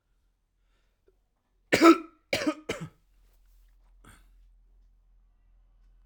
{"three_cough_length": "6.1 s", "three_cough_amplitude": 17422, "three_cough_signal_mean_std_ratio": 0.21, "survey_phase": "alpha (2021-03-01 to 2021-08-12)", "age": "18-44", "gender": "Male", "wearing_mask": "No", "symptom_cough_any": true, "symptom_diarrhoea": true, "symptom_fatigue": true, "symptom_fever_high_temperature": true, "symptom_headache": true, "symptom_onset": "5 days", "smoker_status": "Current smoker (e-cigarettes or vapes only)", "respiratory_condition_asthma": false, "respiratory_condition_other": false, "recruitment_source": "Test and Trace", "submission_delay": "2 days", "covid_test_result": "Positive", "covid_test_method": "RT-qPCR", "covid_ct_value": 11.6, "covid_ct_gene": "N gene", "covid_ct_mean": 11.8, "covid_viral_load": "130000000 copies/ml", "covid_viral_load_category": "High viral load (>1M copies/ml)"}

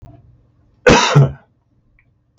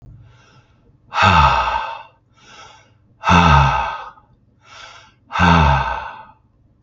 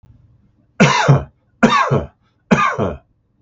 {"cough_length": "2.4 s", "cough_amplitude": 32768, "cough_signal_mean_std_ratio": 0.35, "exhalation_length": "6.8 s", "exhalation_amplitude": 32768, "exhalation_signal_mean_std_ratio": 0.47, "three_cough_length": "3.4 s", "three_cough_amplitude": 32768, "three_cough_signal_mean_std_ratio": 0.49, "survey_phase": "beta (2021-08-13 to 2022-03-07)", "age": "45-64", "gender": "Male", "wearing_mask": "No", "symptom_none": true, "smoker_status": "Ex-smoker", "respiratory_condition_asthma": false, "respiratory_condition_other": false, "recruitment_source": "REACT", "submission_delay": "1 day", "covid_test_result": "Negative", "covid_test_method": "RT-qPCR", "influenza_a_test_result": "Negative", "influenza_b_test_result": "Negative"}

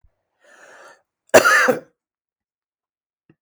{"cough_length": "3.4 s", "cough_amplitude": 32768, "cough_signal_mean_std_ratio": 0.27, "survey_phase": "beta (2021-08-13 to 2022-03-07)", "age": "65+", "gender": "Male", "wearing_mask": "No", "symptom_none": true, "smoker_status": "Never smoked", "respiratory_condition_asthma": false, "respiratory_condition_other": false, "recruitment_source": "REACT", "submission_delay": "1 day", "covid_test_result": "Negative", "covid_test_method": "RT-qPCR"}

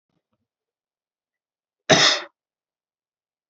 {"cough_length": "3.5 s", "cough_amplitude": 30499, "cough_signal_mean_std_ratio": 0.22, "survey_phase": "beta (2021-08-13 to 2022-03-07)", "age": "18-44", "gender": "Male", "wearing_mask": "No", "symptom_cough_any": true, "symptom_sore_throat": true, "symptom_onset": "5 days", "smoker_status": "Never smoked", "respiratory_condition_asthma": false, "respiratory_condition_other": false, "recruitment_source": "REACT", "submission_delay": "1 day", "covid_test_result": "Negative", "covid_test_method": "RT-qPCR"}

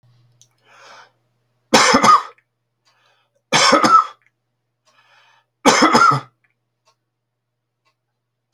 {"three_cough_length": "8.5 s", "three_cough_amplitude": 32767, "three_cough_signal_mean_std_ratio": 0.35, "survey_phase": "beta (2021-08-13 to 2022-03-07)", "age": "65+", "gender": "Male", "wearing_mask": "No", "symptom_none": true, "smoker_status": "Never smoked", "respiratory_condition_asthma": false, "respiratory_condition_other": false, "recruitment_source": "REACT", "submission_delay": "8 days", "covid_test_result": "Negative", "covid_test_method": "RT-qPCR"}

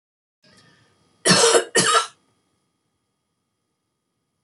{"cough_length": "4.4 s", "cough_amplitude": 29932, "cough_signal_mean_std_ratio": 0.32, "survey_phase": "beta (2021-08-13 to 2022-03-07)", "age": "65+", "gender": "Female", "wearing_mask": "No", "symptom_none": true, "smoker_status": "Never smoked", "respiratory_condition_asthma": false, "respiratory_condition_other": false, "recruitment_source": "REACT", "submission_delay": "1 day", "covid_test_result": "Negative", "covid_test_method": "RT-qPCR"}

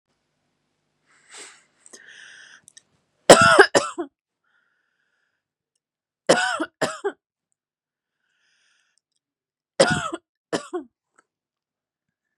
{"three_cough_length": "12.4 s", "three_cough_amplitude": 32768, "three_cough_signal_mean_std_ratio": 0.22, "survey_phase": "beta (2021-08-13 to 2022-03-07)", "age": "18-44", "gender": "Female", "wearing_mask": "No", "symptom_none": true, "smoker_status": "Never smoked", "respiratory_condition_asthma": true, "respiratory_condition_other": false, "recruitment_source": "REACT", "submission_delay": "1 day", "covid_test_result": "Negative", "covid_test_method": "RT-qPCR", "influenza_a_test_result": "Negative", "influenza_b_test_result": "Negative"}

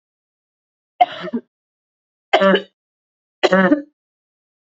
{"three_cough_length": "4.8 s", "three_cough_amplitude": 27890, "three_cough_signal_mean_std_ratio": 0.31, "survey_phase": "beta (2021-08-13 to 2022-03-07)", "age": "18-44", "gender": "Female", "wearing_mask": "No", "symptom_none": true, "symptom_onset": "12 days", "smoker_status": "Ex-smoker", "respiratory_condition_asthma": false, "respiratory_condition_other": false, "recruitment_source": "REACT", "submission_delay": "2 days", "covid_test_result": "Negative", "covid_test_method": "RT-qPCR", "influenza_a_test_result": "Negative", "influenza_b_test_result": "Negative"}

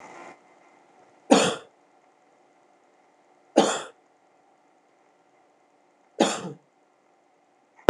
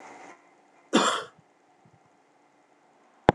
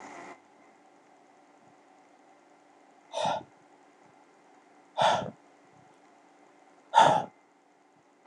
{"three_cough_length": "7.9 s", "three_cough_amplitude": 26028, "three_cough_signal_mean_std_ratio": 0.22, "cough_length": "3.3 s", "cough_amplitude": 26028, "cough_signal_mean_std_ratio": 0.23, "exhalation_length": "8.3 s", "exhalation_amplitude": 13703, "exhalation_signal_mean_std_ratio": 0.27, "survey_phase": "beta (2021-08-13 to 2022-03-07)", "age": "45-64", "gender": "Male", "wearing_mask": "No", "symptom_none": true, "symptom_onset": "12 days", "smoker_status": "Ex-smoker", "respiratory_condition_asthma": false, "respiratory_condition_other": false, "recruitment_source": "REACT", "submission_delay": "4 days", "covid_test_result": "Negative", "covid_test_method": "RT-qPCR"}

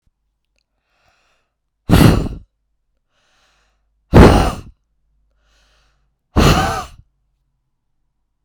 {"exhalation_length": "8.4 s", "exhalation_amplitude": 32768, "exhalation_signal_mean_std_ratio": 0.29, "survey_phase": "beta (2021-08-13 to 2022-03-07)", "age": "45-64", "gender": "Female", "wearing_mask": "No", "symptom_runny_or_blocked_nose": true, "symptom_sore_throat": true, "symptom_abdominal_pain": true, "symptom_diarrhoea": true, "symptom_fatigue": true, "symptom_fever_high_temperature": true, "symptom_headache": true, "smoker_status": "Ex-smoker", "respiratory_condition_asthma": false, "respiratory_condition_other": false, "recruitment_source": "Test and Trace", "submission_delay": "2 days", "covid_test_result": "Positive", "covid_test_method": "RT-qPCR", "covid_ct_value": 30.2, "covid_ct_gene": "ORF1ab gene"}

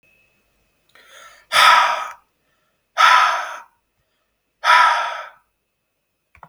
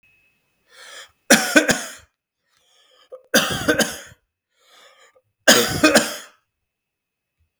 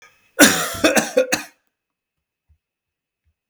{"exhalation_length": "6.5 s", "exhalation_amplitude": 32768, "exhalation_signal_mean_std_ratio": 0.39, "three_cough_length": "7.6 s", "three_cough_amplitude": 32768, "three_cough_signal_mean_std_ratio": 0.33, "cough_length": "3.5 s", "cough_amplitude": 32768, "cough_signal_mean_std_ratio": 0.34, "survey_phase": "beta (2021-08-13 to 2022-03-07)", "age": "18-44", "gender": "Male", "wearing_mask": "No", "symptom_none": true, "smoker_status": "Never smoked", "respiratory_condition_asthma": false, "respiratory_condition_other": false, "recruitment_source": "REACT", "submission_delay": "33 days", "covid_test_result": "Negative", "covid_test_method": "RT-qPCR", "influenza_a_test_result": "Unknown/Void", "influenza_b_test_result": "Unknown/Void"}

